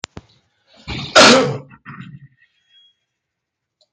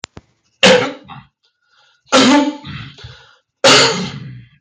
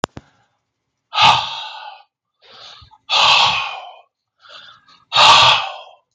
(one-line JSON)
{"cough_length": "3.9 s", "cough_amplitude": 32768, "cough_signal_mean_std_ratio": 0.3, "three_cough_length": "4.6 s", "three_cough_amplitude": 32768, "three_cough_signal_mean_std_ratio": 0.46, "exhalation_length": "6.1 s", "exhalation_amplitude": 32766, "exhalation_signal_mean_std_ratio": 0.42, "survey_phase": "beta (2021-08-13 to 2022-03-07)", "age": "45-64", "gender": "Male", "wearing_mask": "Yes", "symptom_none": true, "smoker_status": "Never smoked", "respiratory_condition_asthma": false, "respiratory_condition_other": false, "recruitment_source": "REACT", "submission_delay": "1 day", "covid_test_result": "Negative", "covid_test_method": "RT-qPCR"}